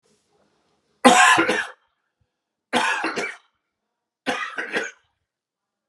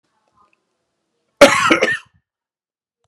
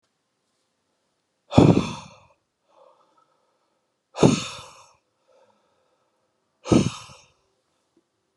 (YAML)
three_cough_length: 5.9 s
three_cough_amplitude: 31963
three_cough_signal_mean_std_ratio: 0.36
cough_length: 3.1 s
cough_amplitude: 32768
cough_signal_mean_std_ratio: 0.29
exhalation_length: 8.4 s
exhalation_amplitude: 29418
exhalation_signal_mean_std_ratio: 0.23
survey_phase: beta (2021-08-13 to 2022-03-07)
age: 45-64
gender: Male
wearing_mask: 'No'
symptom_none: true
smoker_status: Ex-smoker
respiratory_condition_asthma: false
respiratory_condition_other: false
recruitment_source: REACT
submission_delay: 1 day
covid_test_result: Negative
covid_test_method: RT-qPCR
influenza_a_test_result: Negative
influenza_b_test_result: Negative